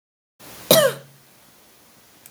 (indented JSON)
{
  "cough_length": "2.3 s",
  "cough_amplitude": 32768,
  "cough_signal_mean_std_ratio": 0.28,
  "survey_phase": "beta (2021-08-13 to 2022-03-07)",
  "age": "45-64",
  "gender": "Female",
  "wearing_mask": "No",
  "symptom_none": true,
  "smoker_status": "Current smoker (1 to 10 cigarettes per day)",
  "respiratory_condition_asthma": false,
  "respiratory_condition_other": false,
  "recruitment_source": "REACT",
  "submission_delay": "2 days",
  "covid_test_result": "Negative",
  "covid_test_method": "RT-qPCR",
  "influenza_a_test_result": "Negative",
  "influenza_b_test_result": "Negative"
}